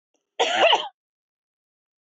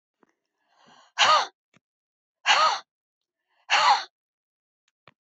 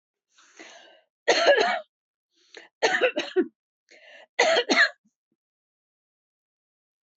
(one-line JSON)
{"cough_length": "2.0 s", "cough_amplitude": 15688, "cough_signal_mean_std_ratio": 0.36, "exhalation_length": "5.2 s", "exhalation_amplitude": 17893, "exhalation_signal_mean_std_ratio": 0.34, "three_cough_length": "7.2 s", "three_cough_amplitude": 17585, "three_cough_signal_mean_std_ratio": 0.36, "survey_phase": "beta (2021-08-13 to 2022-03-07)", "age": "45-64", "gender": "Female", "wearing_mask": "No", "symptom_none": true, "smoker_status": "Never smoked", "respiratory_condition_asthma": false, "respiratory_condition_other": false, "recruitment_source": "REACT", "submission_delay": "1 day", "covid_test_result": "Negative", "covid_test_method": "RT-qPCR", "influenza_a_test_result": "Negative", "influenza_b_test_result": "Negative"}